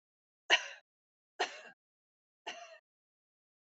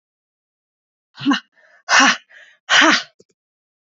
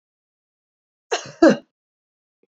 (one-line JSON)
{"three_cough_length": "3.8 s", "three_cough_amplitude": 8410, "three_cough_signal_mean_std_ratio": 0.2, "exhalation_length": "3.9 s", "exhalation_amplitude": 32156, "exhalation_signal_mean_std_ratio": 0.35, "cough_length": "2.5 s", "cough_amplitude": 28180, "cough_signal_mean_std_ratio": 0.21, "survey_phase": "beta (2021-08-13 to 2022-03-07)", "age": "18-44", "gender": "Female", "wearing_mask": "No", "symptom_cough_any": true, "symptom_runny_or_blocked_nose": true, "symptom_shortness_of_breath": true, "symptom_headache": true, "symptom_change_to_sense_of_smell_or_taste": true, "symptom_onset": "3 days", "smoker_status": "Never smoked", "respiratory_condition_asthma": false, "respiratory_condition_other": false, "recruitment_source": "Test and Trace", "submission_delay": "2 days", "covid_test_result": "Positive", "covid_test_method": "RT-qPCR", "covid_ct_value": 22.1, "covid_ct_gene": "N gene"}